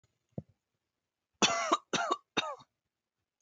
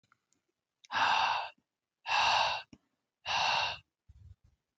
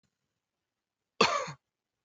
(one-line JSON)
{"three_cough_length": "3.4 s", "three_cough_amplitude": 8949, "three_cough_signal_mean_std_ratio": 0.34, "exhalation_length": "4.8 s", "exhalation_amplitude": 5262, "exhalation_signal_mean_std_ratio": 0.5, "cough_length": "2.0 s", "cough_amplitude": 14122, "cough_signal_mean_std_ratio": 0.25, "survey_phase": "beta (2021-08-13 to 2022-03-07)", "age": "18-44", "gender": "Male", "wearing_mask": "No", "symptom_none": true, "smoker_status": "Never smoked", "respiratory_condition_asthma": false, "respiratory_condition_other": false, "recruitment_source": "REACT", "submission_delay": "17 days", "covid_test_result": "Negative", "covid_test_method": "RT-qPCR", "influenza_a_test_result": "Negative", "influenza_b_test_result": "Negative"}